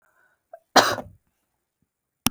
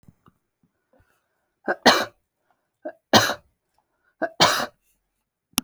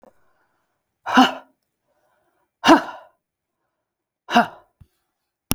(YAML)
cough_length: 2.3 s
cough_amplitude: 32768
cough_signal_mean_std_ratio: 0.22
three_cough_length: 5.6 s
three_cough_amplitude: 32768
three_cough_signal_mean_std_ratio: 0.27
exhalation_length: 5.5 s
exhalation_amplitude: 32768
exhalation_signal_mean_std_ratio: 0.24
survey_phase: alpha (2021-03-01 to 2021-08-12)
age: 45-64
gender: Female
wearing_mask: 'No'
symptom_none: true
smoker_status: Never smoked
respiratory_condition_asthma: false
respiratory_condition_other: false
recruitment_source: REACT
submission_delay: 3 days
covid_test_result: Negative
covid_test_method: RT-qPCR